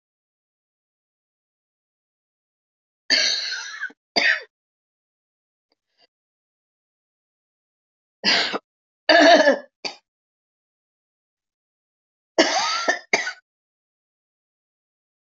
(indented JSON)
{
  "three_cough_length": "15.3 s",
  "three_cough_amplitude": 31723,
  "three_cough_signal_mean_std_ratio": 0.28,
  "survey_phase": "beta (2021-08-13 to 2022-03-07)",
  "age": "45-64",
  "gender": "Female",
  "wearing_mask": "No",
  "symptom_new_continuous_cough": true,
  "symptom_runny_or_blocked_nose": true,
  "symptom_shortness_of_breath": true,
  "symptom_sore_throat": true,
  "symptom_abdominal_pain": true,
  "symptom_fatigue": true,
  "symptom_headache": true,
  "symptom_onset": "3 days",
  "smoker_status": "Ex-smoker",
  "respiratory_condition_asthma": true,
  "respiratory_condition_other": false,
  "recruitment_source": "Test and Trace",
  "submission_delay": "2 days",
  "covid_test_result": "Positive",
  "covid_test_method": "RT-qPCR"
}